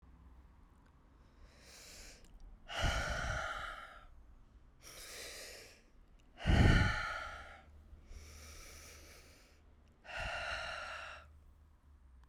{"exhalation_length": "12.3 s", "exhalation_amplitude": 5215, "exhalation_signal_mean_std_ratio": 0.41, "survey_phase": "beta (2021-08-13 to 2022-03-07)", "age": "65+", "gender": "Female", "wearing_mask": "No", "symptom_cough_any": true, "symptom_runny_or_blocked_nose": true, "symptom_change_to_sense_of_smell_or_taste": true, "symptom_onset": "4 days", "smoker_status": "Never smoked", "respiratory_condition_asthma": false, "respiratory_condition_other": false, "recruitment_source": "Test and Trace", "submission_delay": "2 days", "covid_test_result": "Positive", "covid_test_method": "LAMP"}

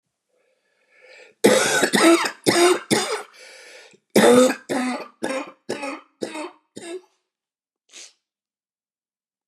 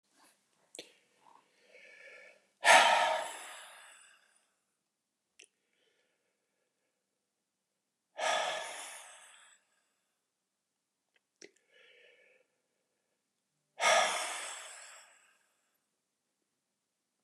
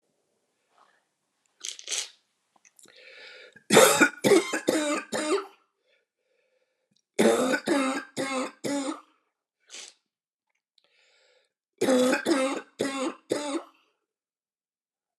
{"cough_length": "9.5 s", "cough_amplitude": 27848, "cough_signal_mean_std_ratio": 0.41, "exhalation_length": "17.2 s", "exhalation_amplitude": 12587, "exhalation_signal_mean_std_ratio": 0.25, "three_cough_length": "15.2 s", "three_cough_amplitude": 23116, "three_cough_signal_mean_std_ratio": 0.39, "survey_phase": "alpha (2021-03-01 to 2021-08-12)", "age": "45-64", "gender": "Male", "wearing_mask": "No", "symptom_cough_any": true, "symptom_diarrhoea": true, "symptom_fatigue": true, "symptom_onset": "3 days", "smoker_status": "Never smoked", "respiratory_condition_asthma": false, "respiratory_condition_other": false, "recruitment_source": "Test and Trace", "submission_delay": "1 day", "covid_test_result": "Positive", "covid_test_method": "RT-qPCR", "covid_ct_value": 17.7, "covid_ct_gene": "ORF1ab gene", "covid_ct_mean": 18.9, "covid_viral_load": "650000 copies/ml", "covid_viral_load_category": "Low viral load (10K-1M copies/ml)"}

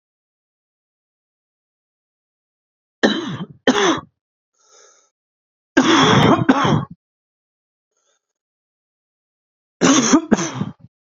{"three_cough_length": "11.1 s", "three_cough_amplitude": 32767, "three_cough_signal_mean_std_ratio": 0.36, "survey_phase": "beta (2021-08-13 to 2022-03-07)", "age": "18-44", "gender": "Male", "wearing_mask": "No", "symptom_cough_any": true, "symptom_shortness_of_breath": true, "symptom_diarrhoea": true, "symptom_fatigue": true, "symptom_fever_high_temperature": true, "symptom_headache": true, "symptom_change_to_sense_of_smell_or_taste": true, "symptom_loss_of_taste": true, "symptom_onset": "3 days", "smoker_status": "Current smoker (e-cigarettes or vapes only)", "respiratory_condition_asthma": false, "respiratory_condition_other": false, "recruitment_source": "Test and Trace", "submission_delay": "1 day", "covid_test_result": "Positive", "covid_test_method": "RT-qPCR", "covid_ct_value": 19.1, "covid_ct_gene": "ORF1ab gene", "covid_ct_mean": 20.3, "covid_viral_load": "230000 copies/ml", "covid_viral_load_category": "Low viral load (10K-1M copies/ml)"}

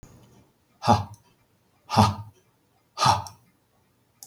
{"exhalation_length": "4.3 s", "exhalation_amplitude": 23880, "exhalation_signal_mean_std_ratio": 0.31, "survey_phase": "beta (2021-08-13 to 2022-03-07)", "age": "65+", "gender": "Male", "wearing_mask": "No", "symptom_cough_any": true, "smoker_status": "Never smoked", "respiratory_condition_asthma": false, "respiratory_condition_other": false, "recruitment_source": "REACT", "submission_delay": "2 days", "covid_test_result": "Negative", "covid_test_method": "RT-qPCR", "influenza_a_test_result": "Negative", "influenza_b_test_result": "Negative"}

